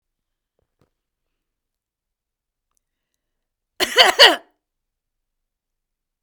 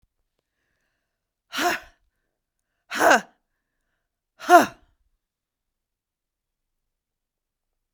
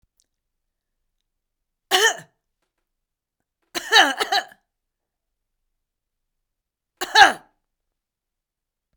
{
  "cough_length": "6.2 s",
  "cough_amplitude": 32768,
  "cough_signal_mean_std_ratio": 0.18,
  "exhalation_length": "7.9 s",
  "exhalation_amplitude": 32767,
  "exhalation_signal_mean_std_ratio": 0.2,
  "three_cough_length": "9.0 s",
  "three_cough_amplitude": 32768,
  "three_cough_signal_mean_std_ratio": 0.22,
  "survey_phase": "beta (2021-08-13 to 2022-03-07)",
  "age": "65+",
  "gender": "Female",
  "wearing_mask": "No",
  "symptom_cough_any": true,
  "symptom_shortness_of_breath": true,
  "symptom_sore_throat": true,
  "symptom_fatigue": true,
  "symptom_headache": true,
  "symptom_change_to_sense_of_smell_or_taste": true,
  "symptom_onset": "12 days",
  "smoker_status": "Never smoked",
  "respiratory_condition_asthma": true,
  "respiratory_condition_other": true,
  "recruitment_source": "REACT",
  "submission_delay": "1 day",
  "covid_test_result": "Negative",
  "covid_test_method": "RT-qPCR",
  "covid_ct_value": 38.0,
  "covid_ct_gene": "N gene",
  "influenza_a_test_result": "Negative",
  "influenza_b_test_result": "Negative"
}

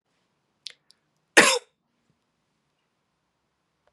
{
  "cough_length": "3.9 s",
  "cough_amplitude": 32558,
  "cough_signal_mean_std_ratio": 0.17,
  "survey_phase": "beta (2021-08-13 to 2022-03-07)",
  "age": "18-44",
  "gender": "Female",
  "wearing_mask": "No",
  "symptom_sore_throat": true,
  "symptom_fatigue": true,
  "symptom_headache": true,
  "symptom_other": true,
  "smoker_status": "Never smoked",
  "respiratory_condition_asthma": false,
  "respiratory_condition_other": false,
  "recruitment_source": "Test and Trace",
  "submission_delay": "1 day",
  "covid_test_result": "Positive",
  "covid_test_method": "LFT"
}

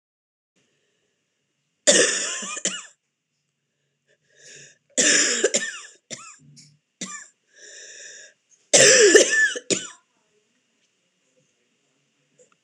{
  "three_cough_length": "12.6 s",
  "three_cough_amplitude": 26028,
  "three_cough_signal_mean_std_ratio": 0.33,
  "survey_phase": "alpha (2021-03-01 to 2021-08-12)",
  "age": "45-64",
  "gender": "Female",
  "wearing_mask": "No",
  "symptom_cough_any": true,
  "symptom_fatigue": true,
  "symptom_headache": true,
  "symptom_onset": "12 days",
  "smoker_status": "Never smoked",
  "respiratory_condition_asthma": false,
  "respiratory_condition_other": true,
  "recruitment_source": "REACT",
  "submission_delay": "2 days",
  "covid_test_result": "Negative",
  "covid_test_method": "RT-qPCR"
}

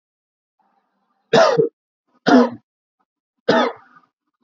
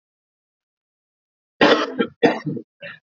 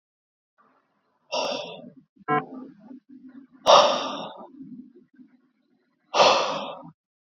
{
  "three_cough_length": "4.4 s",
  "three_cough_amplitude": 27964,
  "three_cough_signal_mean_std_ratio": 0.34,
  "cough_length": "3.2 s",
  "cough_amplitude": 27800,
  "cough_signal_mean_std_ratio": 0.34,
  "exhalation_length": "7.3 s",
  "exhalation_amplitude": 24204,
  "exhalation_signal_mean_std_ratio": 0.35,
  "survey_phase": "alpha (2021-03-01 to 2021-08-12)",
  "age": "18-44",
  "gender": "Male",
  "wearing_mask": "No",
  "symptom_cough_any": true,
  "symptom_change_to_sense_of_smell_or_taste": true,
  "symptom_onset": "3 days",
  "smoker_status": "Current smoker (1 to 10 cigarettes per day)",
  "respiratory_condition_asthma": false,
  "respiratory_condition_other": false,
  "recruitment_source": "Test and Trace",
  "submission_delay": "2 days",
  "covid_test_result": "Positive",
  "covid_test_method": "RT-qPCR",
  "covid_ct_value": 22.6,
  "covid_ct_gene": "ORF1ab gene",
  "covid_ct_mean": 23.3,
  "covid_viral_load": "23000 copies/ml",
  "covid_viral_load_category": "Low viral load (10K-1M copies/ml)"
}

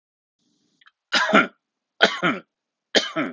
{
  "three_cough_length": "3.3 s",
  "three_cough_amplitude": 32766,
  "three_cough_signal_mean_std_ratio": 0.37,
  "survey_phase": "alpha (2021-03-01 to 2021-08-12)",
  "age": "18-44",
  "gender": "Male",
  "wearing_mask": "No",
  "symptom_none": true,
  "symptom_onset": "4 days",
  "smoker_status": "Ex-smoker",
  "respiratory_condition_asthma": false,
  "respiratory_condition_other": false,
  "recruitment_source": "Test and Trace",
  "submission_delay": "1 day",
  "covid_test_result": "Positive",
  "covid_test_method": "RT-qPCR"
}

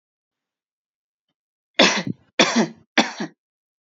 {
  "three_cough_length": "3.8 s",
  "three_cough_amplitude": 28096,
  "three_cough_signal_mean_std_ratio": 0.32,
  "survey_phase": "beta (2021-08-13 to 2022-03-07)",
  "age": "18-44",
  "gender": "Female",
  "wearing_mask": "No",
  "symptom_none": true,
  "smoker_status": "Ex-smoker",
  "respiratory_condition_asthma": false,
  "respiratory_condition_other": false,
  "recruitment_source": "REACT",
  "submission_delay": "2 days",
  "covid_test_result": "Negative",
  "covid_test_method": "RT-qPCR"
}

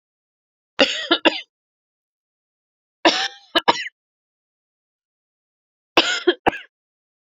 {
  "three_cough_length": "7.3 s",
  "three_cough_amplitude": 32768,
  "three_cough_signal_mean_std_ratio": 0.27,
  "survey_phase": "beta (2021-08-13 to 2022-03-07)",
  "age": "18-44",
  "gender": "Female",
  "wearing_mask": "No",
  "symptom_cough_any": true,
  "symptom_new_continuous_cough": true,
  "symptom_runny_or_blocked_nose": true,
  "symptom_shortness_of_breath": true,
  "symptom_sore_throat": true,
  "symptom_fatigue": true,
  "symptom_fever_high_temperature": true,
  "symptom_headache": true,
  "symptom_change_to_sense_of_smell_or_taste": true,
  "symptom_loss_of_taste": true,
  "smoker_status": "Ex-smoker",
  "respiratory_condition_asthma": false,
  "respiratory_condition_other": false,
  "recruitment_source": "Test and Trace",
  "submission_delay": "1 day",
  "covid_test_result": "Positive",
  "covid_test_method": "RT-qPCR",
  "covid_ct_value": 15.0,
  "covid_ct_gene": "ORF1ab gene",
  "covid_ct_mean": 15.2,
  "covid_viral_load": "10000000 copies/ml",
  "covid_viral_load_category": "High viral load (>1M copies/ml)"
}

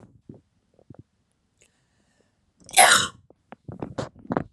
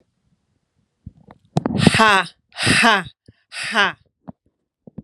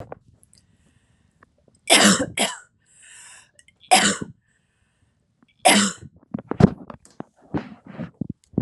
{
  "cough_length": "4.5 s",
  "cough_amplitude": 32310,
  "cough_signal_mean_std_ratio": 0.25,
  "exhalation_length": "5.0 s",
  "exhalation_amplitude": 32768,
  "exhalation_signal_mean_std_ratio": 0.38,
  "three_cough_length": "8.6 s",
  "three_cough_amplitude": 32469,
  "three_cough_signal_mean_std_ratio": 0.31,
  "survey_phase": "alpha (2021-03-01 to 2021-08-12)",
  "age": "18-44",
  "gender": "Female",
  "wearing_mask": "No",
  "symptom_cough_any": true,
  "symptom_onset": "2 days",
  "smoker_status": "Never smoked",
  "respiratory_condition_asthma": false,
  "respiratory_condition_other": false,
  "recruitment_source": "Test and Trace",
  "submission_delay": "1 day",
  "covid_test_result": "Positive",
  "covid_test_method": "RT-qPCR",
  "covid_ct_value": 26.2,
  "covid_ct_gene": "N gene",
  "covid_ct_mean": 26.3,
  "covid_viral_load": "2400 copies/ml",
  "covid_viral_load_category": "Minimal viral load (< 10K copies/ml)"
}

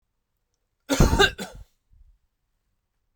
{
  "cough_length": "3.2 s",
  "cough_amplitude": 22904,
  "cough_signal_mean_std_ratio": 0.28,
  "survey_phase": "beta (2021-08-13 to 2022-03-07)",
  "age": "18-44",
  "gender": "Male",
  "wearing_mask": "No",
  "symptom_none": true,
  "smoker_status": "Never smoked",
  "respiratory_condition_asthma": false,
  "respiratory_condition_other": false,
  "recruitment_source": "REACT",
  "submission_delay": "2 days",
  "covid_test_result": "Negative",
  "covid_test_method": "RT-qPCR"
}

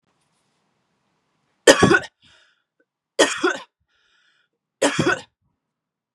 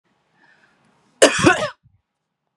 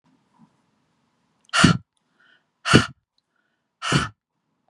{
  "three_cough_length": "6.1 s",
  "three_cough_amplitude": 32768,
  "three_cough_signal_mean_std_ratio": 0.28,
  "cough_length": "2.6 s",
  "cough_amplitude": 32768,
  "cough_signal_mean_std_ratio": 0.29,
  "exhalation_length": "4.7 s",
  "exhalation_amplitude": 32768,
  "exhalation_signal_mean_std_ratio": 0.26,
  "survey_phase": "beta (2021-08-13 to 2022-03-07)",
  "age": "45-64",
  "gender": "Female",
  "wearing_mask": "No",
  "symptom_none": true,
  "smoker_status": "Ex-smoker",
  "respiratory_condition_asthma": false,
  "respiratory_condition_other": false,
  "recruitment_source": "REACT",
  "submission_delay": "6 days",
  "covid_test_result": "Negative",
  "covid_test_method": "RT-qPCR",
  "influenza_a_test_result": "Negative",
  "influenza_b_test_result": "Negative"
}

